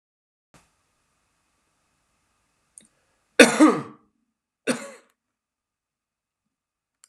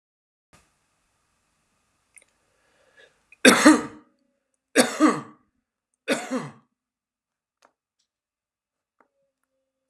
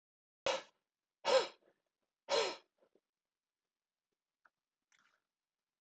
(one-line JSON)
{"cough_length": "7.1 s", "cough_amplitude": 32767, "cough_signal_mean_std_ratio": 0.18, "three_cough_length": "9.9 s", "three_cough_amplitude": 31886, "three_cough_signal_mean_std_ratio": 0.22, "exhalation_length": "5.8 s", "exhalation_amplitude": 3720, "exhalation_signal_mean_std_ratio": 0.24, "survey_phase": "beta (2021-08-13 to 2022-03-07)", "age": "18-44", "gender": "Male", "wearing_mask": "No", "symptom_none": true, "smoker_status": "Never smoked", "respiratory_condition_asthma": false, "respiratory_condition_other": false, "recruitment_source": "REACT", "submission_delay": "0 days", "covid_test_result": "Negative", "covid_test_method": "RT-qPCR"}